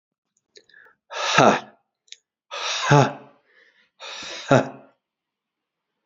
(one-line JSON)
{"exhalation_length": "6.1 s", "exhalation_amplitude": 28431, "exhalation_signal_mean_std_ratio": 0.32, "survey_phase": "beta (2021-08-13 to 2022-03-07)", "age": "18-44", "gender": "Male", "wearing_mask": "No", "symptom_cough_any": true, "symptom_runny_or_blocked_nose": true, "symptom_fever_high_temperature": true, "symptom_headache": true, "symptom_change_to_sense_of_smell_or_taste": true, "symptom_onset": "9 days", "smoker_status": "Never smoked", "respiratory_condition_asthma": false, "respiratory_condition_other": false, "recruitment_source": "Test and Trace", "submission_delay": "2 days", "covid_test_result": "Positive", "covid_test_method": "RT-qPCR", "covid_ct_value": 23.6, "covid_ct_gene": "ORF1ab gene", "covid_ct_mean": 23.7, "covid_viral_load": "17000 copies/ml", "covid_viral_load_category": "Low viral load (10K-1M copies/ml)"}